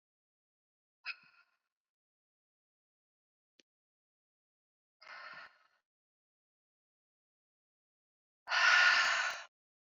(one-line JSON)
{"exhalation_length": "9.9 s", "exhalation_amplitude": 5622, "exhalation_signal_mean_std_ratio": 0.24, "survey_phase": "beta (2021-08-13 to 2022-03-07)", "age": "45-64", "gender": "Female", "wearing_mask": "No", "symptom_none": true, "smoker_status": "Never smoked", "respiratory_condition_asthma": false, "respiratory_condition_other": false, "recruitment_source": "REACT", "submission_delay": "1 day", "covid_test_result": "Negative", "covid_test_method": "RT-qPCR", "influenza_a_test_result": "Negative", "influenza_b_test_result": "Negative"}